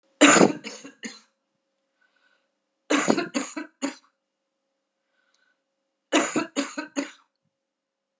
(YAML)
three_cough_length: 8.2 s
three_cough_amplitude: 24704
three_cough_signal_mean_std_ratio: 0.3
survey_phase: beta (2021-08-13 to 2022-03-07)
age: 45-64
gender: Female
wearing_mask: 'No'
symptom_cough_any: true
symptom_runny_or_blocked_nose: true
symptom_onset: 6 days
smoker_status: Never smoked
respiratory_condition_asthma: false
respiratory_condition_other: false
recruitment_source: Test and Trace
submission_delay: 2 days
covid_test_result: Positive
covid_test_method: ePCR